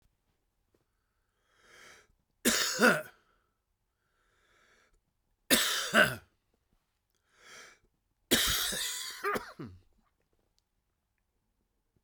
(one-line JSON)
{"three_cough_length": "12.0 s", "three_cough_amplitude": 11910, "three_cough_signal_mean_std_ratio": 0.31, "survey_phase": "beta (2021-08-13 to 2022-03-07)", "age": "65+", "gender": "Male", "wearing_mask": "No", "symptom_cough_any": true, "symptom_runny_or_blocked_nose": true, "symptom_shortness_of_breath": true, "symptom_fatigue": true, "smoker_status": "Current smoker (1 to 10 cigarettes per day)", "respiratory_condition_asthma": false, "respiratory_condition_other": false, "recruitment_source": "Test and Trace", "submission_delay": "2 days", "covid_test_result": "Positive", "covid_test_method": "LFT"}